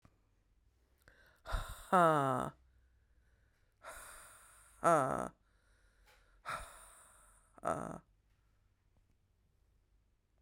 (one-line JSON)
{"exhalation_length": "10.4 s", "exhalation_amplitude": 5291, "exhalation_signal_mean_std_ratio": 0.29, "survey_phase": "beta (2021-08-13 to 2022-03-07)", "age": "45-64", "gender": "Female", "wearing_mask": "No", "symptom_cough_any": true, "symptom_new_continuous_cough": true, "symptom_fatigue": true, "symptom_fever_high_temperature": true, "symptom_headache": true, "symptom_onset": "3 days", "smoker_status": "Never smoked", "respiratory_condition_asthma": false, "respiratory_condition_other": false, "recruitment_source": "Test and Trace", "submission_delay": "2 days", "covid_test_result": "Positive", "covid_test_method": "RT-qPCR", "covid_ct_value": 31.3, "covid_ct_gene": "ORF1ab gene", "covid_ct_mean": 32.0, "covid_viral_load": "33 copies/ml", "covid_viral_load_category": "Minimal viral load (< 10K copies/ml)"}